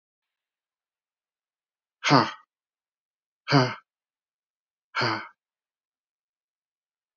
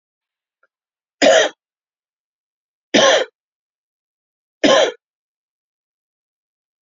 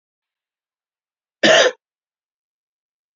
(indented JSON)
{
  "exhalation_length": "7.2 s",
  "exhalation_amplitude": 22126,
  "exhalation_signal_mean_std_ratio": 0.23,
  "three_cough_length": "6.8 s",
  "three_cough_amplitude": 32319,
  "three_cough_signal_mean_std_ratio": 0.28,
  "cough_length": "3.2 s",
  "cough_amplitude": 29608,
  "cough_signal_mean_std_ratio": 0.24,
  "survey_phase": "beta (2021-08-13 to 2022-03-07)",
  "age": "45-64",
  "gender": "Male",
  "wearing_mask": "No",
  "symptom_cough_any": true,
  "symptom_sore_throat": true,
  "symptom_other": true,
  "smoker_status": "Never smoked",
  "respiratory_condition_asthma": false,
  "respiratory_condition_other": false,
  "recruitment_source": "Test and Trace",
  "submission_delay": "1 day",
  "covid_test_result": "Positive",
  "covid_test_method": "RT-qPCR",
  "covid_ct_value": 25.4,
  "covid_ct_gene": "ORF1ab gene",
  "covid_ct_mean": 25.6,
  "covid_viral_load": "3900 copies/ml",
  "covid_viral_load_category": "Minimal viral load (< 10K copies/ml)"
}